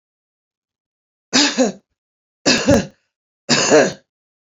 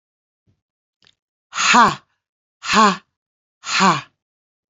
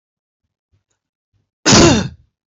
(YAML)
three_cough_length: 4.5 s
three_cough_amplitude: 31910
three_cough_signal_mean_std_ratio: 0.4
exhalation_length: 4.7 s
exhalation_amplitude: 28191
exhalation_signal_mean_std_ratio: 0.35
cough_length: 2.5 s
cough_amplitude: 32768
cough_signal_mean_std_ratio: 0.33
survey_phase: beta (2021-08-13 to 2022-03-07)
age: 45-64
gender: Female
wearing_mask: 'No'
symptom_cough_any: true
symptom_runny_or_blocked_nose: true
symptom_shortness_of_breath: true
symptom_diarrhoea: true
symptom_fatigue: true
symptom_onset: 12 days
smoker_status: Current smoker (1 to 10 cigarettes per day)
respiratory_condition_asthma: false
respiratory_condition_other: false
recruitment_source: REACT
submission_delay: 2 days
covid_test_result: Negative
covid_test_method: RT-qPCR
influenza_a_test_result: Negative
influenza_b_test_result: Negative